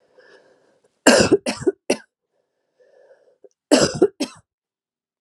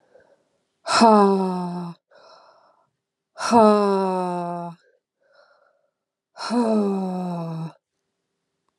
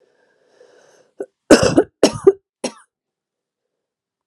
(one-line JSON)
{"cough_length": "5.2 s", "cough_amplitude": 32767, "cough_signal_mean_std_ratio": 0.3, "exhalation_length": "8.8 s", "exhalation_amplitude": 27841, "exhalation_signal_mean_std_ratio": 0.46, "three_cough_length": "4.3 s", "three_cough_amplitude": 32768, "three_cough_signal_mean_std_ratio": 0.25, "survey_phase": "alpha (2021-03-01 to 2021-08-12)", "age": "18-44", "gender": "Female", "wearing_mask": "No", "symptom_cough_any": true, "symptom_shortness_of_breath": true, "symptom_diarrhoea": true, "symptom_fatigue": true, "smoker_status": "Never smoked", "respiratory_condition_asthma": true, "respiratory_condition_other": false, "recruitment_source": "Test and Trace", "submission_delay": "2 days", "covid_test_result": "Positive", "covid_test_method": "RT-qPCR", "covid_ct_value": 18.1, "covid_ct_gene": "ORF1ab gene", "covid_ct_mean": 18.4, "covid_viral_load": "930000 copies/ml", "covid_viral_load_category": "Low viral load (10K-1M copies/ml)"}